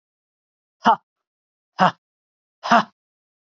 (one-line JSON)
{"exhalation_length": "3.6 s", "exhalation_amplitude": 32768, "exhalation_signal_mean_std_ratio": 0.24, "survey_phase": "beta (2021-08-13 to 2022-03-07)", "age": "45-64", "gender": "Female", "wearing_mask": "No", "symptom_cough_any": true, "symptom_runny_or_blocked_nose": true, "symptom_headache": true, "symptom_loss_of_taste": true, "symptom_other": true, "symptom_onset": "3 days", "smoker_status": "Ex-smoker", "respiratory_condition_asthma": false, "respiratory_condition_other": false, "recruitment_source": "Test and Trace", "submission_delay": "2 days", "covid_test_result": "Positive", "covid_test_method": "RT-qPCR", "covid_ct_value": 17.4, "covid_ct_gene": "ORF1ab gene", "covid_ct_mean": 18.2, "covid_viral_load": "1000000 copies/ml", "covid_viral_load_category": "High viral load (>1M copies/ml)"}